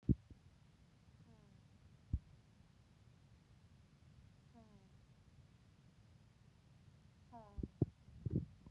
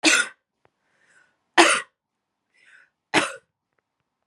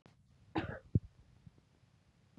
exhalation_length: 8.7 s
exhalation_amplitude: 2839
exhalation_signal_mean_std_ratio: 0.26
three_cough_length: 4.3 s
three_cough_amplitude: 32689
three_cough_signal_mean_std_ratio: 0.28
cough_length: 2.4 s
cough_amplitude: 4213
cough_signal_mean_std_ratio: 0.24
survey_phase: beta (2021-08-13 to 2022-03-07)
age: 18-44
gender: Female
wearing_mask: 'No'
symptom_runny_or_blocked_nose: true
symptom_fatigue: true
smoker_status: Never smoked
respiratory_condition_asthma: false
respiratory_condition_other: false
recruitment_source: Test and Trace
submission_delay: 2 days
covid_test_result: Positive
covid_test_method: LFT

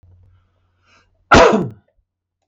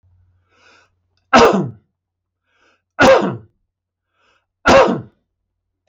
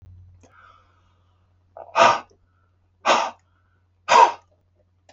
cough_length: 2.5 s
cough_amplitude: 32768
cough_signal_mean_std_ratio: 0.3
three_cough_length: 5.9 s
three_cough_amplitude: 32768
three_cough_signal_mean_std_ratio: 0.33
exhalation_length: 5.1 s
exhalation_amplitude: 30926
exhalation_signal_mean_std_ratio: 0.29
survey_phase: beta (2021-08-13 to 2022-03-07)
age: 45-64
gender: Male
wearing_mask: 'No'
symptom_none: true
symptom_onset: 12 days
smoker_status: Never smoked
respiratory_condition_asthma: false
respiratory_condition_other: false
recruitment_source: REACT
submission_delay: 1 day
covid_test_result: Negative
covid_test_method: RT-qPCR
influenza_a_test_result: Negative
influenza_b_test_result: Negative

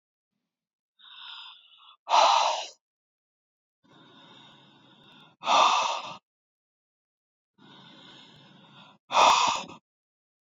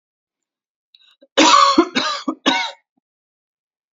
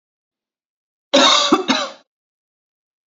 exhalation_length: 10.6 s
exhalation_amplitude: 17100
exhalation_signal_mean_std_ratio: 0.32
three_cough_length: 3.9 s
three_cough_amplitude: 31994
three_cough_signal_mean_std_ratio: 0.39
cough_length: 3.1 s
cough_amplitude: 29214
cough_signal_mean_std_ratio: 0.37
survey_phase: beta (2021-08-13 to 2022-03-07)
age: 45-64
gender: Female
wearing_mask: 'No'
symptom_none: true
smoker_status: Never smoked
respiratory_condition_asthma: false
respiratory_condition_other: false
recruitment_source: REACT
submission_delay: 12 days
covid_test_result: Negative
covid_test_method: RT-qPCR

